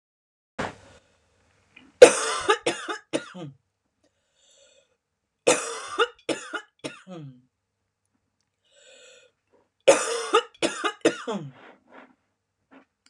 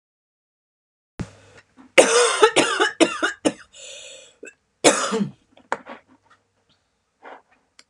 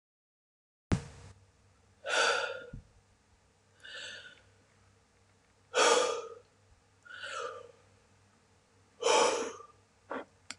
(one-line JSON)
{"three_cough_length": "13.1 s", "three_cough_amplitude": 32768, "three_cough_signal_mean_std_ratio": 0.26, "cough_length": "7.9 s", "cough_amplitude": 32768, "cough_signal_mean_std_ratio": 0.34, "exhalation_length": "10.6 s", "exhalation_amplitude": 7921, "exhalation_signal_mean_std_ratio": 0.36, "survey_phase": "beta (2021-08-13 to 2022-03-07)", "age": "45-64", "gender": "Female", "wearing_mask": "No", "symptom_abdominal_pain": true, "symptom_diarrhoea": true, "symptom_onset": "12 days", "smoker_status": "Never smoked", "respiratory_condition_asthma": false, "respiratory_condition_other": false, "recruitment_source": "REACT", "submission_delay": "2 days", "covid_test_result": "Negative", "covid_test_method": "RT-qPCR"}